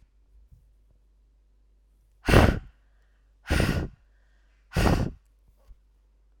exhalation_length: 6.4 s
exhalation_amplitude: 28172
exhalation_signal_mean_std_ratio: 0.31
survey_phase: alpha (2021-03-01 to 2021-08-12)
age: 45-64
gender: Female
wearing_mask: 'No'
symptom_none: true
smoker_status: Never smoked
respiratory_condition_asthma: false
respiratory_condition_other: false
recruitment_source: REACT
submission_delay: 3 days
covid_test_result: Negative
covid_test_method: RT-qPCR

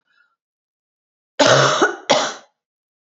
cough_length: 3.1 s
cough_amplitude: 32768
cough_signal_mean_std_ratio: 0.39
survey_phase: beta (2021-08-13 to 2022-03-07)
age: 18-44
gender: Female
wearing_mask: 'No'
symptom_cough_any: true
symptom_new_continuous_cough: true
symptom_runny_or_blocked_nose: true
symptom_sore_throat: true
symptom_fatigue: true
symptom_onset: 3 days
smoker_status: Never smoked
respiratory_condition_asthma: false
respiratory_condition_other: false
recruitment_source: Test and Trace
submission_delay: 1 day
covid_test_result: Negative
covid_test_method: RT-qPCR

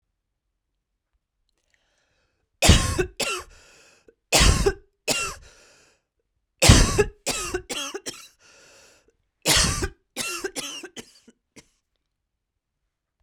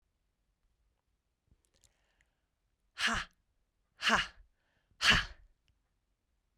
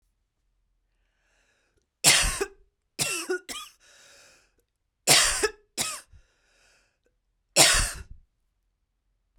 cough_length: 13.2 s
cough_amplitude: 32768
cough_signal_mean_std_ratio: 0.33
exhalation_length: 6.6 s
exhalation_amplitude: 8119
exhalation_signal_mean_std_ratio: 0.25
three_cough_length: 9.4 s
three_cough_amplitude: 25149
three_cough_signal_mean_std_ratio: 0.31
survey_phase: beta (2021-08-13 to 2022-03-07)
age: 45-64
gender: Female
wearing_mask: 'No'
symptom_cough_any: true
symptom_runny_or_blocked_nose: true
symptom_shortness_of_breath: true
symptom_fatigue: true
symptom_headache: true
smoker_status: Never smoked
respiratory_condition_asthma: true
respiratory_condition_other: false
recruitment_source: Test and Trace
submission_delay: 3 days
covid_test_result: Positive
covid_test_method: RT-qPCR
covid_ct_value: 31.3
covid_ct_gene: N gene
covid_ct_mean: 31.8
covid_viral_load: 38 copies/ml
covid_viral_load_category: Minimal viral load (< 10K copies/ml)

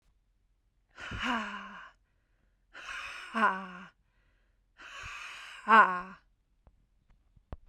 exhalation_length: 7.7 s
exhalation_amplitude: 14535
exhalation_signal_mean_std_ratio: 0.3
survey_phase: beta (2021-08-13 to 2022-03-07)
age: 18-44
gender: Female
wearing_mask: 'No'
symptom_cough_any: true
symptom_runny_or_blocked_nose: true
symptom_shortness_of_breath: true
symptom_sore_throat: true
symptom_fatigue: true
symptom_headache: true
symptom_onset: 12 days
smoker_status: Never smoked
respiratory_condition_asthma: false
respiratory_condition_other: false
recruitment_source: REACT
submission_delay: 3 days
covid_test_result: Negative
covid_test_method: RT-qPCR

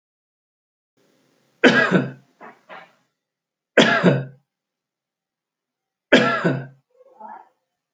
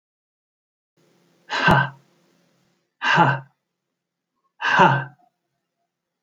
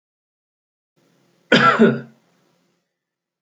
three_cough_length: 7.9 s
three_cough_amplitude: 29760
three_cough_signal_mean_std_ratio: 0.32
exhalation_length: 6.2 s
exhalation_amplitude: 28234
exhalation_signal_mean_std_ratio: 0.33
cough_length: 3.4 s
cough_amplitude: 29408
cough_signal_mean_std_ratio: 0.29
survey_phase: alpha (2021-03-01 to 2021-08-12)
age: 65+
gender: Male
wearing_mask: 'No'
symptom_none: true
smoker_status: Ex-smoker
respiratory_condition_asthma: false
respiratory_condition_other: false
recruitment_source: REACT
submission_delay: 1 day
covid_test_result: Negative
covid_test_method: RT-qPCR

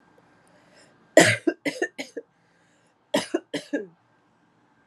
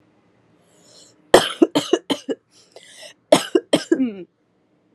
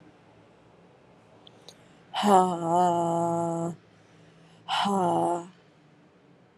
three_cough_length: 4.9 s
three_cough_amplitude: 32393
three_cough_signal_mean_std_ratio: 0.27
cough_length: 4.9 s
cough_amplitude: 32768
cough_signal_mean_std_ratio: 0.3
exhalation_length: 6.6 s
exhalation_amplitude: 17651
exhalation_signal_mean_std_ratio: 0.49
survey_phase: alpha (2021-03-01 to 2021-08-12)
age: 18-44
gender: Female
wearing_mask: 'No'
symptom_cough_any: true
symptom_onset: 2 days
smoker_status: Current smoker (1 to 10 cigarettes per day)
respiratory_condition_asthma: false
respiratory_condition_other: false
recruitment_source: Test and Trace
submission_delay: 1 day
covid_test_result: Positive
covid_test_method: RT-qPCR
covid_ct_value: 26.3
covid_ct_gene: N gene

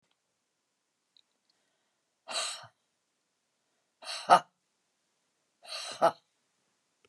exhalation_length: 7.1 s
exhalation_amplitude: 18735
exhalation_signal_mean_std_ratio: 0.18
survey_phase: beta (2021-08-13 to 2022-03-07)
age: 65+
gender: Female
wearing_mask: 'No'
symptom_headache: true
smoker_status: Ex-smoker
respiratory_condition_asthma: false
respiratory_condition_other: false
recruitment_source: REACT
submission_delay: 1 day
covid_test_result: Negative
covid_test_method: RT-qPCR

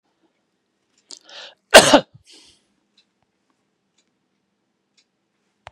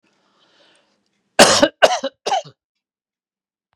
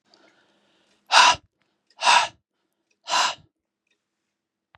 cough_length: 5.7 s
cough_amplitude: 32768
cough_signal_mean_std_ratio: 0.16
three_cough_length: 3.8 s
three_cough_amplitude: 32768
three_cough_signal_mean_std_ratio: 0.29
exhalation_length: 4.8 s
exhalation_amplitude: 30600
exhalation_signal_mean_std_ratio: 0.29
survey_phase: beta (2021-08-13 to 2022-03-07)
age: 65+
gender: Male
wearing_mask: 'No'
symptom_none: true
smoker_status: Ex-smoker
respiratory_condition_asthma: false
respiratory_condition_other: false
recruitment_source: REACT
submission_delay: 2 days
covid_test_result: Negative
covid_test_method: RT-qPCR
influenza_a_test_result: Negative
influenza_b_test_result: Negative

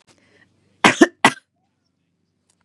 cough_length: 2.6 s
cough_amplitude: 32768
cough_signal_mean_std_ratio: 0.21
survey_phase: beta (2021-08-13 to 2022-03-07)
age: 18-44
gender: Female
wearing_mask: 'No'
symptom_none: true
smoker_status: Never smoked
respiratory_condition_asthma: false
respiratory_condition_other: false
recruitment_source: REACT
submission_delay: 1 day
covid_test_result: Negative
covid_test_method: RT-qPCR
influenza_a_test_result: Negative
influenza_b_test_result: Negative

